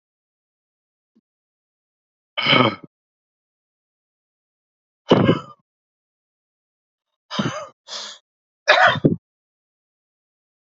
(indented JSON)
{
  "exhalation_length": "10.7 s",
  "exhalation_amplitude": 28037,
  "exhalation_signal_mean_std_ratio": 0.26,
  "survey_phase": "beta (2021-08-13 to 2022-03-07)",
  "age": "18-44",
  "gender": "Male",
  "wearing_mask": "No",
  "symptom_shortness_of_breath": true,
  "symptom_fatigue": true,
  "symptom_headache": true,
  "symptom_other": true,
  "symptom_onset": "12 days",
  "smoker_status": "Ex-smoker",
  "respiratory_condition_asthma": true,
  "respiratory_condition_other": false,
  "recruitment_source": "REACT",
  "submission_delay": "0 days",
  "covid_test_result": "Negative",
  "covid_test_method": "RT-qPCR",
  "influenza_a_test_result": "Negative",
  "influenza_b_test_result": "Negative"
}